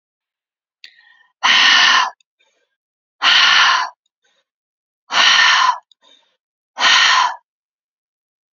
{"exhalation_length": "8.5 s", "exhalation_amplitude": 32767, "exhalation_signal_mean_std_ratio": 0.46, "survey_phase": "beta (2021-08-13 to 2022-03-07)", "age": "45-64", "gender": "Female", "wearing_mask": "No", "symptom_none": true, "smoker_status": "Never smoked", "respiratory_condition_asthma": false, "respiratory_condition_other": false, "recruitment_source": "Test and Trace", "submission_delay": "1 day", "covid_test_result": "Negative", "covid_test_method": "RT-qPCR"}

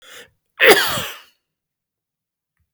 {"cough_length": "2.7 s", "cough_amplitude": 32768, "cough_signal_mean_std_ratio": 0.29, "survey_phase": "beta (2021-08-13 to 2022-03-07)", "age": "45-64", "gender": "Male", "wearing_mask": "No", "symptom_none": true, "smoker_status": "Ex-smoker", "respiratory_condition_asthma": false, "respiratory_condition_other": false, "recruitment_source": "REACT", "submission_delay": "1 day", "covid_test_result": "Negative", "covid_test_method": "RT-qPCR", "influenza_a_test_result": "Negative", "influenza_b_test_result": "Negative"}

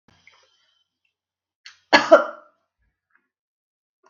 {"cough_length": "4.1 s", "cough_amplitude": 32768, "cough_signal_mean_std_ratio": 0.18, "survey_phase": "beta (2021-08-13 to 2022-03-07)", "age": "45-64", "gender": "Female", "wearing_mask": "No", "symptom_none": true, "smoker_status": "Never smoked", "respiratory_condition_asthma": false, "respiratory_condition_other": false, "recruitment_source": "REACT", "submission_delay": "1 day", "covid_test_result": "Negative", "covid_test_method": "RT-qPCR"}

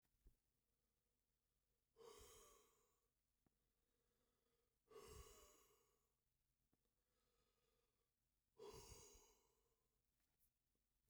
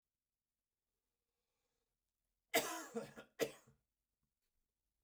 {"exhalation_length": "11.1 s", "exhalation_amplitude": 108, "exhalation_signal_mean_std_ratio": 0.42, "cough_length": "5.0 s", "cough_amplitude": 2633, "cough_signal_mean_std_ratio": 0.23, "survey_phase": "beta (2021-08-13 to 2022-03-07)", "age": "45-64", "gender": "Male", "wearing_mask": "No", "symptom_cough_any": true, "symptom_runny_or_blocked_nose": true, "symptom_headache": true, "symptom_onset": "12 days", "smoker_status": "Never smoked", "respiratory_condition_asthma": true, "respiratory_condition_other": false, "recruitment_source": "REACT", "submission_delay": "0 days", "covid_test_result": "Negative", "covid_test_method": "RT-qPCR"}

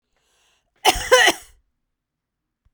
{"cough_length": "2.7 s", "cough_amplitude": 31314, "cough_signal_mean_std_ratio": 0.29, "survey_phase": "beta (2021-08-13 to 2022-03-07)", "age": "45-64", "gender": "Female", "wearing_mask": "Yes", "symptom_sore_throat": true, "symptom_fatigue": true, "symptom_onset": "6 days", "smoker_status": "Never smoked", "respiratory_condition_asthma": false, "respiratory_condition_other": false, "recruitment_source": "Test and Trace", "submission_delay": "2 days", "covid_test_result": "Positive", "covid_test_method": "RT-qPCR", "covid_ct_value": 37.2, "covid_ct_gene": "ORF1ab gene"}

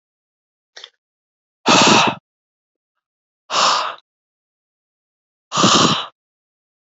{"exhalation_length": "7.0 s", "exhalation_amplitude": 30805, "exhalation_signal_mean_std_ratio": 0.35, "survey_phase": "beta (2021-08-13 to 2022-03-07)", "age": "18-44", "gender": "Male", "wearing_mask": "No", "symptom_none": true, "smoker_status": "Never smoked", "respiratory_condition_asthma": false, "respiratory_condition_other": false, "recruitment_source": "REACT", "submission_delay": "1 day", "covid_test_result": "Negative", "covid_test_method": "RT-qPCR"}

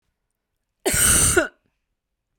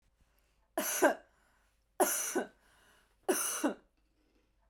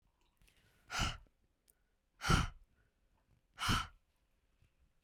{"cough_length": "2.4 s", "cough_amplitude": 23176, "cough_signal_mean_std_ratio": 0.42, "three_cough_length": "4.7 s", "three_cough_amplitude": 7590, "three_cough_signal_mean_std_ratio": 0.39, "exhalation_length": "5.0 s", "exhalation_amplitude": 4392, "exhalation_signal_mean_std_ratio": 0.3, "survey_phase": "beta (2021-08-13 to 2022-03-07)", "age": "18-44", "gender": "Female", "wearing_mask": "No", "symptom_none": true, "smoker_status": "Never smoked", "respiratory_condition_asthma": false, "respiratory_condition_other": false, "recruitment_source": "REACT", "submission_delay": "1 day", "covid_test_result": "Negative", "covid_test_method": "RT-qPCR", "influenza_a_test_result": "Negative", "influenza_b_test_result": "Negative"}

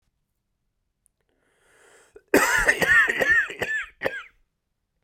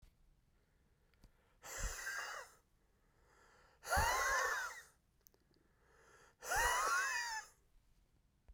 {"cough_length": "5.0 s", "cough_amplitude": 21364, "cough_signal_mean_std_ratio": 0.43, "exhalation_length": "8.5 s", "exhalation_amplitude": 2435, "exhalation_signal_mean_std_ratio": 0.47, "survey_phase": "beta (2021-08-13 to 2022-03-07)", "age": "45-64", "gender": "Male", "wearing_mask": "No", "symptom_cough_any": true, "symptom_runny_or_blocked_nose": true, "symptom_shortness_of_breath": true, "symptom_fever_high_temperature": true, "symptom_headache": true, "symptom_onset": "5 days", "smoker_status": "Never smoked", "respiratory_condition_asthma": false, "respiratory_condition_other": false, "recruitment_source": "Test and Trace", "submission_delay": "1 day", "covid_test_result": "Positive", "covid_test_method": "RT-qPCR", "covid_ct_value": 23.7, "covid_ct_gene": "N gene"}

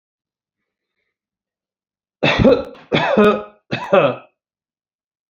{"three_cough_length": "5.3 s", "three_cough_amplitude": 32767, "three_cough_signal_mean_std_ratio": 0.37, "survey_phase": "beta (2021-08-13 to 2022-03-07)", "age": "65+", "gender": "Male", "wearing_mask": "No", "symptom_none": true, "smoker_status": "Never smoked", "respiratory_condition_asthma": false, "respiratory_condition_other": false, "recruitment_source": "REACT", "submission_delay": "6 days", "covid_test_result": "Negative", "covid_test_method": "RT-qPCR", "influenza_a_test_result": "Negative", "influenza_b_test_result": "Negative"}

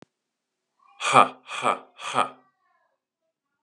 {"exhalation_length": "3.6 s", "exhalation_amplitude": 30011, "exhalation_signal_mean_std_ratio": 0.28, "survey_phase": "beta (2021-08-13 to 2022-03-07)", "age": "18-44", "gender": "Male", "wearing_mask": "No", "symptom_cough_any": true, "symptom_runny_or_blocked_nose": true, "symptom_sore_throat": true, "symptom_onset": "13 days", "smoker_status": "Never smoked", "respiratory_condition_asthma": false, "respiratory_condition_other": false, "recruitment_source": "REACT", "submission_delay": "2 days", "covid_test_result": "Negative", "covid_test_method": "RT-qPCR", "influenza_a_test_result": "Negative", "influenza_b_test_result": "Negative"}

